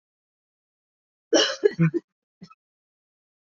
{
  "cough_length": "3.4 s",
  "cough_amplitude": 19517,
  "cough_signal_mean_std_ratio": 0.28,
  "survey_phase": "beta (2021-08-13 to 2022-03-07)",
  "age": "18-44",
  "gender": "Female",
  "wearing_mask": "No",
  "symptom_cough_any": true,
  "symptom_new_continuous_cough": true,
  "symptom_runny_or_blocked_nose": true,
  "symptom_shortness_of_breath": true,
  "symptom_sore_throat": true,
  "symptom_fatigue": true,
  "symptom_fever_high_temperature": true,
  "symptom_headache": true,
  "symptom_change_to_sense_of_smell_or_taste": true,
  "symptom_other": true,
  "symptom_onset": "3 days",
  "smoker_status": "Ex-smoker",
  "respiratory_condition_asthma": false,
  "respiratory_condition_other": false,
  "recruitment_source": "Test and Trace",
  "submission_delay": "2 days",
  "covid_test_result": "Positive",
  "covid_test_method": "RT-qPCR"
}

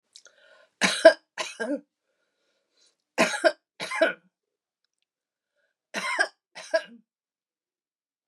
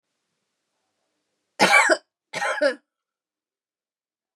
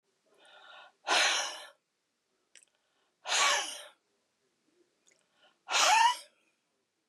{
  "three_cough_length": "8.3 s",
  "three_cough_amplitude": 27245,
  "three_cough_signal_mean_std_ratio": 0.26,
  "cough_length": "4.4 s",
  "cough_amplitude": 26199,
  "cough_signal_mean_std_ratio": 0.3,
  "exhalation_length": "7.1 s",
  "exhalation_amplitude": 7031,
  "exhalation_signal_mean_std_ratio": 0.36,
  "survey_phase": "beta (2021-08-13 to 2022-03-07)",
  "age": "65+",
  "gender": "Female",
  "wearing_mask": "No",
  "symptom_none": true,
  "smoker_status": "Never smoked",
  "respiratory_condition_asthma": false,
  "respiratory_condition_other": false,
  "recruitment_source": "REACT",
  "submission_delay": "1 day",
  "covid_test_result": "Negative",
  "covid_test_method": "RT-qPCR"
}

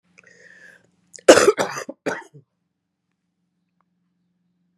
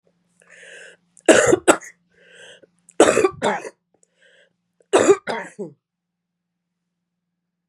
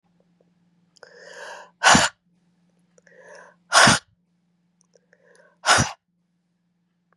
{
  "cough_length": "4.8 s",
  "cough_amplitude": 32768,
  "cough_signal_mean_std_ratio": 0.21,
  "three_cough_length": "7.7 s",
  "three_cough_amplitude": 32768,
  "three_cough_signal_mean_std_ratio": 0.3,
  "exhalation_length": "7.2 s",
  "exhalation_amplitude": 32376,
  "exhalation_signal_mean_std_ratio": 0.26,
  "survey_phase": "beta (2021-08-13 to 2022-03-07)",
  "age": "45-64",
  "gender": "Female",
  "wearing_mask": "No",
  "symptom_runny_or_blocked_nose": true,
  "smoker_status": "Ex-smoker",
  "respiratory_condition_asthma": false,
  "respiratory_condition_other": false,
  "recruitment_source": "Test and Trace",
  "submission_delay": "1 day",
  "covid_test_result": "Positive",
  "covid_test_method": "LFT"
}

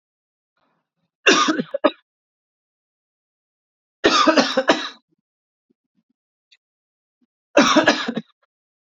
{
  "three_cough_length": "9.0 s",
  "three_cough_amplitude": 30929,
  "three_cough_signal_mean_std_ratio": 0.32,
  "survey_phase": "alpha (2021-03-01 to 2021-08-12)",
  "age": "18-44",
  "gender": "Male",
  "wearing_mask": "Yes",
  "symptom_cough_any": true,
  "symptom_fatigue": true,
  "symptom_headache": true,
  "symptom_change_to_sense_of_smell_or_taste": true,
  "symptom_loss_of_taste": true,
  "smoker_status": "Prefer not to say",
  "respiratory_condition_asthma": false,
  "respiratory_condition_other": false,
  "recruitment_source": "Test and Trace",
  "submission_delay": "2 days",
  "covid_test_result": "Positive",
  "covid_test_method": "RT-qPCR"
}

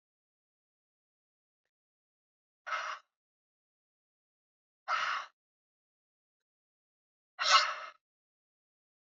{
  "exhalation_length": "9.1 s",
  "exhalation_amplitude": 12032,
  "exhalation_signal_mean_std_ratio": 0.22,
  "survey_phase": "beta (2021-08-13 to 2022-03-07)",
  "age": "65+",
  "gender": "Female",
  "wearing_mask": "No",
  "symptom_none": true,
  "smoker_status": "Never smoked",
  "respiratory_condition_asthma": true,
  "respiratory_condition_other": false,
  "recruitment_source": "REACT",
  "submission_delay": "2 days",
  "covid_test_result": "Negative",
  "covid_test_method": "RT-qPCR",
  "influenza_a_test_result": "Negative",
  "influenza_b_test_result": "Negative"
}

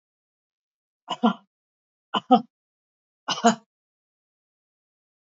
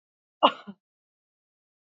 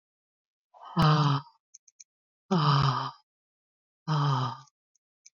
{
  "three_cough_length": "5.4 s",
  "three_cough_amplitude": 21051,
  "three_cough_signal_mean_std_ratio": 0.21,
  "cough_length": "2.0 s",
  "cough_amplitude": 19459,
  "cough_signal_mean_std_ratio": 0.16,
  "exhalation_length": "5.4 s",
  "exhalation_amplitude": 9657,
  "exhalation_signal_mean_std_ratio": 0.46,
  "survey_phase": "beta (2021-08-13 to 2022-03-07)",
  "age": "45-64",
  "gender": "Female",
  "wearing_mask": "No",
  "symptom_none": true,
  "smoker_status": "Current smoker (1 to 10 cigarettes per day)",
  "respiratory_condition_asthma": false,
  "respiratory_condition_other": false,
  "recruitment_source": "REACT",
  "submission_delay": "2 days",
  "covid_test_result": "Negative",
  "covid_test_method": "RT-qPCR",
  "influenza_a_test_result": "Negative",
  "influenza_b_test_result": "Negative"
}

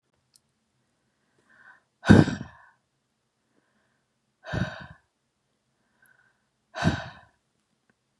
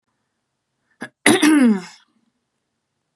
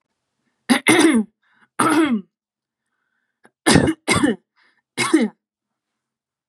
{
  "exhalation_length": "8.2 s",
  "exhalation_amplitude": 29165,
  "exhalation_signal_mean_std_ratio": 0.19,
  "cough_length": "3.2 s",
  "cough_amplitude": 32767,
  "cough_signal_mean_std_ratio": 0.35,
  "three_cough_length": "6.5 s",
  "three_cough_amplitude": 32447,
  "three_cough_signal_mean_std_ratio": 0.42,
  "survey_phase": "beta (2021-08-13 to 2022-03-07)",
  "age": "18-44",
  "gender": "Female",
  "wearing_mask": "No",
  "symptom_none": true,
  "smoker_status": "Never smoked",
  "respiratory_condition_asthma": false,
  "respiratory_condition_other": false,
  "recruitment_source": "REACT",
  "submission_delay": "0 days",
  "covid_test_result": "Negative",
  "covid_test_method": "RT-qPCR",
  "influenza_a_test_result": "Negative",
  "influenza_b_test_result": "Negative"
}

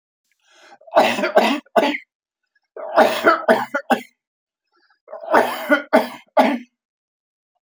{
  "three_cough_length": "7.7 s",
  "three_cough_amplitude": 29735,
  "three_cough_signal_mean_std_ratio": 0.43,
  "survey_phase": "beta (2021-08-13 to 2022-03-07)",
  "age": "65+",
  "gender": "Male",
  "wearing_mask": "No",
  "symptom_none": true,
  "smoker_status": "Never smoked",
  "respiratory_condition_asthma": false,
  "respiratory_condition_other": false,
  "recruitment_source": "REACT",
  "submission_delay": "2 days",
  "covid_test_result": "Negative",
  "covid_test_method": "RT-qPCR",
  "influenza_a_test_result": "Negative",
  "influenza_b_test_result": "Negative"
}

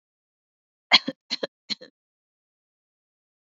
{
  "cough_length": "3.4 s",
  "cough_amplitude": 26952,
  "cough_signal_mean_std_ratio": 0.15,
  "survey_phase": "beta (2021-08-13 to 2022-03-07)",
  "age": "45-64",
  "gender": "Female",
  "wearing_mask": "No",
  "symptom_none": true,
  "smoker_status": "Never smoked",
  "respiratory_condition_asthma": false,
  "respiratory_condition_other": false,
  "recruitment_source": "REACT",
  "submission_delay": "2 days",
  "covid_test_result": "Negative",
  "covid_test_method": "RT-qPCR",
  "influenza_a_test_result": "Negative",
  "influenza_b_test_result": "Negative"
}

